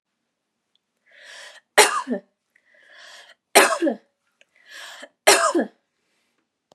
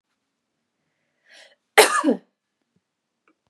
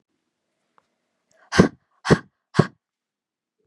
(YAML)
three_cough_length: 6.7 s
three_cough_amplitude: 32768
three_cough_signal_mean_std_ratio: 0.3
cough_length: 3.5 s
cough_amplitude: 32768
cough_signal_mean_std_ratio: 0.22
exhalation_length: 3.7 s
exhalation_amplitude: 32768
exhalation_signal_mean_std_ratio: 0.2
survey_phase: beta (2021-08-13 to 2022-03-07)
age: 18-44
gender: Female
wearing_mask: 'No'
symptom_other: true
smoker_status: Never smoked
respiratory_condition_asthma: true
respiratory_condition_other: false
recruitment_source: REACT
submission_delay: 1 day
covid_test_result: Negative
covid_test_method: RT-qPCR
influenza_a_test_result: Negative
influenza_b_test_result: Negative